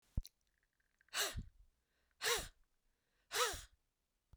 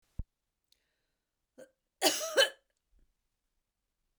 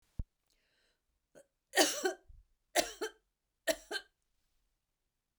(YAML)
exhalation_length: 4.4 s
exhalation_amplitude: 2363
exhalation_signal_mean_std_ratio: 0.35
cough_length: 4.2 s
cough_amplitude: 8957
cough_signal_mean_std_ratio: 0.23
three_cough_length: 5.4 s
three_cough_amplitude: 8704
three_cough_signal_mean_std_ratio: 0.27
survey_phase: beta (2021-08-13 to 2022-03-07)
age: 45-64
gender: Female
wearing_mask: 'No'
symptom_none: true
symptom_onset: 4 days
smoker_status: Never smoked
respiratory_condition_asthma: false
respiratory_condition_other: false
recruitment_source: REACT
submission_delay: 1 day
covid_test_result: Negative
covid_test_method: RT-qPCR